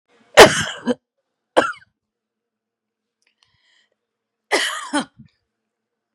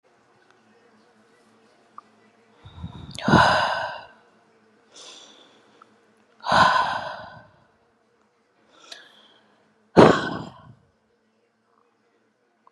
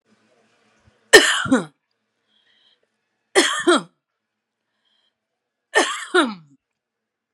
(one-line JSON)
{"cough_length": "6.1 s", "cough_amplitude": 32768, "cough_signal_mean_std_ratio": 0.23, "exhalation_length": "12.7 s", "exhalation_amplitude": 32767, "exhalation_signal_mean_std_ratio": 0.27, "three_cough_length": "7.3 s", "three_cough_amplitude": 32768, "three_cough_signal_mean_std_ratio": 0.29, "survey_phase": "beta (2021-08-13 to 2022-03-07)", "age": "45-64", "gender": "Female", "wearing_mask": "No", "symptom_cough_any": true, "symptom_runny_or_blocked_nose": true, "symptom_sore_throat": true, "symptom_fatigue": true, "symptom_headache": true, "smoker_status": "Never smoked", "respiratory_condition_asthma": false, "respiratory_condition_other": false, "recruitment_source": "Test and Trace", "submission_delay": "1 day", "covid_test_result": "Positive", "covid_test_method": "RT-qPCR", "covid_ct_value": 22.6, "covid_ct_gene": "N gene"}